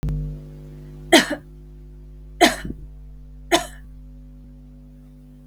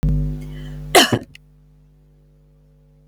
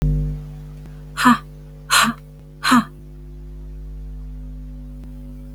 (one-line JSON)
{"three_cough_length": "5.5 s", "three_cough_amplitude": 32768, "three_cough_signal_mean_std_ratio": 0.39, "cough_length": "3.1 s", "cough_amplitude": 32768, "cough_signal_mean_std_ratio": 0.4, "exhalation_length": "5.5 s", "exhalation_amplitude": 31854, "exhalation_signal_mean_std_ratio": 0.54, "survey_phase": "beta (2021-08-13 to 2022-03-07)", "age": "45-64", "gender": "Female", "wearing_mask": "No", "symptom_cough_any": true, "symptom_runny_or_blocked_nose": true, "symptom_sore_throat": true, "symptom_fatigue": true, "symptom_headache": true, "symptom_onset": "7 days", "smoker_status": "Ex-smoker", "respiratory_condition_asthma": false, "respiratory_condition_other": false, "recruitment_source": "REACT", "submission_delay": "4 days", "covid_test_result": "Negative", "covid_test_method": "RT-qPCR", "influenza_a_test_result": "Negative", "influenza_b_test_result": "Negative"}